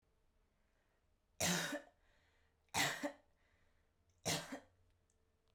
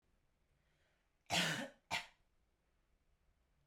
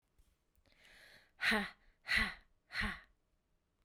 {"three_cough_length": "5.5 s", "three_cough_amplitude": 2463, "three_cough_signal_mean_std_ratio": 0.35, "cough_length": "3.7 s", "cough_amplitude": 2074, "cough_signal_mean_std_ratio": 0.3, "exhalation_length": "3.8 s", "exhalation_amplitude": 3881, "exhalation_signal_mean_std_ratio": 0.36, "survey_phase": "beta (2021-08-13 to 2022-03-07)", "age": "18-44", "gender": "Female", "wearing_mask": "No", "symptom_cough_any": true, "symptom_runny_or_blocked_nose": true, "symptom_fatigue": true, "symptom_onset": "2 days", "smoker_status": "Never smoked", "respiratory_condition_asthma": false, "respiratory_condition_other": false, "recruitment_source": "Test and Trace", "submission_delay": "2 days", "covid_test_result": "Positive", "covid_test_method": "RT-qPCR"}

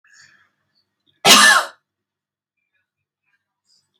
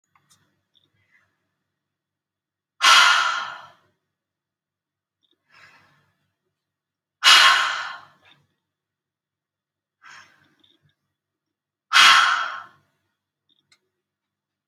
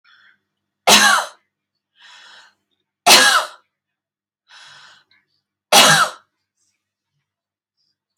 {"cough_length": "4.0 s", "cough_amplitude": 32301, "cough_signal_mean_std_ratio": 0.26, "exhalation_length": "14.7 s", "exhalation_amplitude": 29770, "exhalation_signal_mean_std_ratio": 0.27, "three_cough_length": "8.2 s", "three_cough_amplitude": 32768, "three_cough_signal_mean_std_ratio": 0.3, "survey_phase": "alpha (2021-03-01 to 2021-08-12)", "age": "45-64", "gender": "Female", "wearing_mask": "No", "symptom_none": true, "smoker_status": "Ex-smoker", "respiratory_condition_asthma": false, "respiratory_condition_other": false, "recruitment_source": "REACT", "submission_delay": "2 days", "covid_test_result": "Negative", "covid_test_method": "RT-qPCR"}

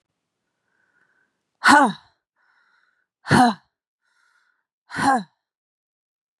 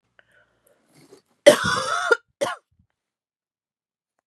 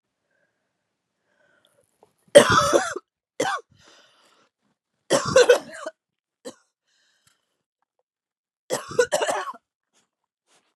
{"exhalation_length": "6.4 s", "exhalation_amplitude": 28188, "exhalation_signal_mean_std_ratio": 0.27, "cough_length": "4.3 s", "cough_amplitude": 32768, "cough_signal_mean_std_ratio": 0.26, "three_cough_length": "10.8 s", "three_cough_amplitude": 32768, "three_cough_signal_mean_std_ratio": 0.27, "survey_phase": "beta (2021-08-13 to 2022-03-07)", "age": "18-44", "gender": "Female", "wearing_mask": "No", "symptom_cough_any": true, "symptom_runny_or_blocked_nose": true, "symptom_sore_throat": true, "symptom_fatigue": true, "symptom_headache": true, "symptom_other": true, "smoker_status": "Never smoked", "respiratory_condition_asthma": false, "respiratory_condition_other": false, "recruitment_source": "Test and Trace", "submission_delay": "1 day", "covid_test_result": "Positive", "covid_test_method": "RT-qPCR", "covid_ct_value": 17.8, "covid_ct_gene": "ORF1ab gene", "covid_ct_mean": 18.1, "covid_viral_load": "1100000 copies/ml", "covid_viral_load_category": "High viral load (>1M copies/ml)"}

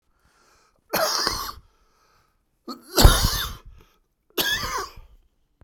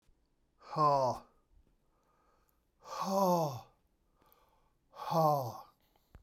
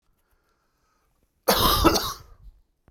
{"three_cough_length": "5.6 s", "three_cough_amplitude": 32768, "three_cough_signal_mean_std_ratio": 0.35, "exhalation_length": "6.2 s", "exhalation_amplitude": 4842, "exhalation_signal_mean_std_ratio": 0.42, "cough_length": "2.9 s", "cough_amplitude": 25755, "cough_signal_mean_std_ratio": 0.38, "survey_phase": "beta (2021-08-13 to 2022-03-07)", "age": "45-64", "gender": "Male", "wearing_mask": "No", "symptom_cough_any": true, "symptom_shortness_of_breath": true, "smoker_status": "Ex-smoker", "respiratory_condition_asthma": false, "respiratory_condition_other": false, "recruitment_source": "Test and Trace", "submission_delay": "1 day", "covid_test_result": "Positive", "covid_test_method": "RT-qPCR"}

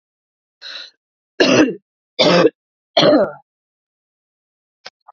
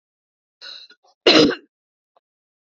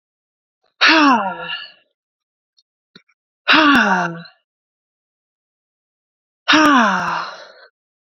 {"three_cough_length": "5.1 s", "three_cough_amplitude": 32768, "three_cough_signal_mean_std_ratio": 0.36, "cough_length": "2.7 s", "cough_amplitude": 30366, "cough_signal_mean_std_ratio": 0.26, "exhalation_length": "8.0 s", "exhalation_amplitude": 32767, "exhalation_signal_mean_std_ratio": 0.41, "survey_phase": "beta (2021-08-13 to 2022-03-07)", "age": "18-44", "gender": "Female", "wearing_mask": "No", "symptom_cough_any": true, "symptom_sore_throat": true, "symptom_fatigue": true, "symptom_fever_high_temperature": true, "symptom_headache": true, "smoker_status": "Never smoked", "respiratory_condition_asthma": true, "respiratory_condition_other": false, "recruitment_source": "Test and Trace", "submission_delay": "2 days", "covid_test_result": "Positive", "covid_test_method": "RT-qPCR", "covid_ct_value": 18.8, "covid_ct_gene": "ORF1ab gene", "covid_ct_mean": 19.0, "covid_viral_load": "610000 copies/ml", "covid_viral_load_category": "Low viral load (10K-1M copies/ml)"}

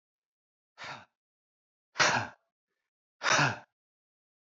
{"exhalation_length": "4.4 s", "exhalation_amplitude": 8800, "exhalation_signal_mean_std_ratio": 0.3, "survey_phase": "alpha (2021-03-01 to 2021-08-12)", "age": "18-44", "gender": "Male", "wearing_mask": "No", "symptom_none": true, "smoker_status": "Never smoked", "respiratory_condition_asthma": false, "respiratory_condition_other": false, "recruitment_source": "REACT", "submission_delay": "1 day", "covid_test_result": "Negative", "covid_test_method": "RT-qPCR"}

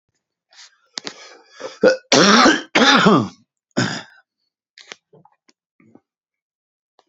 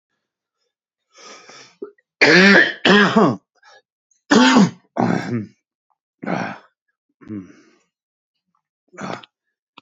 {"cough_length": "7.1 s", "cough_amplitude": 30617, "cough_signal_mean_std_ratio": 0.36, "three_cough_length": "9.8 s", "three_cough_amplitude": 30857, "three_cough_signal_mean_std_ratio": 0.36, "survey_phase": "beta (2021-08-13 to 2022-03-07)", "age": "45-64", "gender": "Male", "wearing_mask": "No", "symptom_cough_any": true, "symptom_sore_throat": true, "symptom_abdominal_pain": true, "symptom_fever_high_temperature": true, "symptom_headache": true, "symptom_change_to_sense_of_smell_or_taste": true, "symptom_loss_of_taste": true, "symptom_onset": "3 days", "smoker_status": "Never smoked", "respiratory_condition_asthma": false, "respiratory_condition_other": false, "recruitment_source": "Test and Trace", "submission_delay": "2 days", "covid_test_result": "Positive", "covid_test_method": "RT-qPCR", "covid_ct_value": 20.4, "covid_ct_gene": "N gene", "covid_ct_mean": 21.3, "covid_viral_load": "100000 copies/ml", "covid_viral_load_category": "Low viral load (10K-1M copies/ml)"}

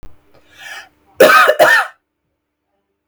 {"cough_length": "3.1 s", "cough_amplitude": 32768, "cough_signal_mean_std_ratio": 0.4, "survey_phase": "beta (2021-08-13 to 2022-03-07)", "age": "45-64", "gender": "Female", "wearing_mask": "No", "symptom_none": true, "symptom_onset": "13 days", "smoker_status": "Ex-smoker", "respiratory_condition_asthma": false, "respiratory_condition_other": false, "recruitment_source": "REACT", "submission_delay": "9 days", "covid_test_result": "Negative", "covid_test_method": "RT-qPCR"}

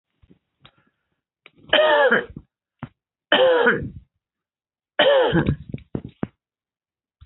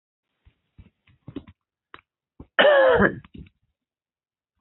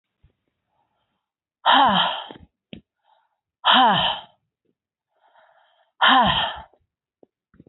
{"three_cough_length": "7.3 s", "three_cough_amplitude": 25214, "three_cough_signal_mean_std_ratio": 0.41, "cough_length": "4.6 s", "cough_amplitude": 20513, "cough_signal_mean_std_ratio": 0.29, "exhalation_length": "7.7 s", "exhalation_amplitude": 23999, "exhalation_signal_mean_std_ratio": 0.37, "survey_phase": "beta (2021-08-13 to 2022-03-07)", "age": "65+", "gender": "Female", "wearing_mask": "No", "symptom_cough_any": true, "symptom_runny_or_blocked_nose": true, "symptom_sore_throat": true, "symptom_fatigue": true, "symptom_headache": true, "symptom_other": true, "smoker_status": "Never smoked", "respiratory_condition_asthma": true, "respiratory_condition_other": false, "recruitment_source": "Test and Trace", "submission_delay": "1 day", "covid_test_result": "Positive", "covid_test_method": "RT-qPCR", "covid_ct_value": 22.1, "covid_ct_gene": "ORF1ab gene", "covid_ct_mean": 23.0, "covid_viral_load": "28000 copies/ml", "covid_viral_load_category": "Low viral load (10K-1M copies/ml)"}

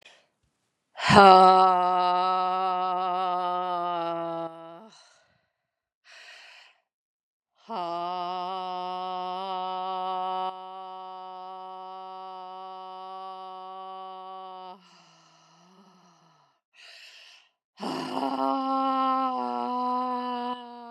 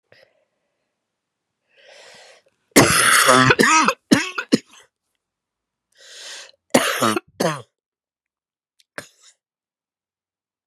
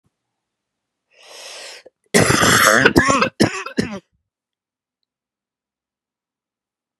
{"exhalation_length": "20.9 s", "exhalation_amplitude": 30648, "exhalation_signal_mean_std_ratio": 0.46, "three_cough_length": "10.7 s", "three_cough_amplitude": 32768, "three_cough_signal_mean_std_ratio": 0.33, "cough_length": "7.0 s", "cough_amplitude": 32768, "cough_signal_mean_std_ratio": 0.36, "survey_phase": "beta (2021-08-13 to 2022-03-07)", "age": "45-64", "gender": "Female", "wearing_mask": "No", "symptom_cough_any": true, "symptom_runny_or_blocked_nose": true, "symptom_sore_throat": true, "symptom_fatigue": true, "symptom_headache": true, "symptom_change_to_sense_of_smell_or_taste": true, "smoker_status": "Ex-smoker", "respiratory_condition_asthma": false, "respiratory_condition_other": false, "recruitment_source": "Test and Trace", "submission_delay": "2 days", "covid_test_result": "Positive", "covid_test_method": "RT-qPCR", "covid_ct_value": 21.5, "covid_ct_gene": "ORF1ab gene"}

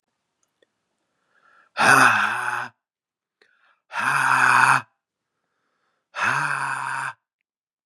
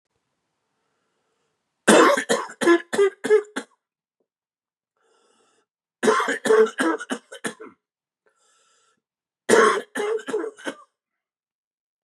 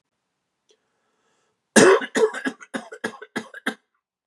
{"exhalation_length": "7.9 s", "exhalation_amplitude": 29578, "exhalation_signal_mean_std_ratio": 0.43, "three_cough_length": "12.0 s", "three_cough_amplitude": 30385, "three_cough_signal_mean_std_ratio": 0.36, "cough_length": "4.3 s", "cough_amplitude": 32465, "cough_signal_mean_std_ratio": 0.3, "survey_phase": "beta (2021-08-13 to 2022-03-07)", "age": "45-64", "gender": "Male", "wearing_mask": "Yes", "symptom_runny_or_blocked_nose": true, "symptom_fatigue": true, "symptom_headache": true, "symptom_onset": "4 days", "smoker_status": "Never smoked", "respiratory_condition_asthma": false, "respiratory_condition_other": false, "recruitment_source": "Test and Trace", "submission_delay": "1 day", "covid_test_result": "Positive", "covid_test_method": "ePCR"}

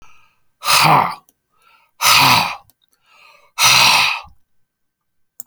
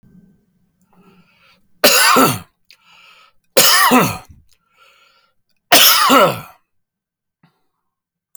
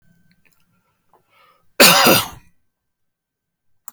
{"exhalation_length": "5.5 s", "exhalation_amplitude": 32768, "exhalation_signal_mean_std_ratio": 0.46, "three_cough_length": "8.4 s", "three_cough_amplitude": 32768, "three_cough_signal_mean_std_ratio": 0.39, "cough_length": "3.9 s", "cough_amplitude": 32768, "cough_signal_mean_std_ratio": 0.27, "survey_phase": "beta (2021-08-13 to 2022-03-07)", "age": "45-64", "gender": "Male", "wearing_mask": "No", "symptom_none": true, "smoker_status": "Ex-smoker", "respiratory_condition_asthma": false, "respiratory_condition_other": false, "recruitment_source": "REACT", "submission_delay": "2 days", "covid_test_result": "Negative", "covid_test_method": "RT-qPCR"}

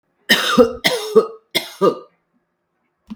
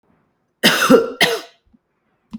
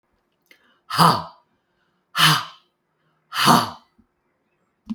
{"three_cough_length": "3.2 s", "three_cough_amplitude": 32768, "three_cough_signal_mean_std_ratio": 0.42, "cough_length": "2.4 s", "cough_amplitude": 32768, "cough_signal_mean_std_ratio": 0.4, "exhalation_length": "4.9 s", "exhalation_amplitude": 32768, "exhalation_signal_mean_std_ratio": 0.33, "survey_phase": "beta (2021-08-13 to 2022-03-07)", "age": "65+", "gender": "Female", "wearing_mask": "No", "symptom_cough_any": true, "symptom_runny_or_blocked_nose": true, "symptom_sore_throat": true, "symptom_fatigue": true, "symptom_headache": true, "symptom_onset": "1 day", "smoker_status": "Never smoked", "respiratory_condition_asthma": false, "respiratory_condition_other": false, "recruitment_source": "Test and Trace", "submission_delay": "1 day", "covid_test_result": "Positive", "covid_test_method": "RT-qPCR", "covid_ct_value": 21.8, "covid_ct_gene": "N gene", "covid_ct_mean": 23.3, "covid_viral_load": "22000 copies/ml", "covid_viral_load_category": "Low viral load (10K-1M copies/ml)"}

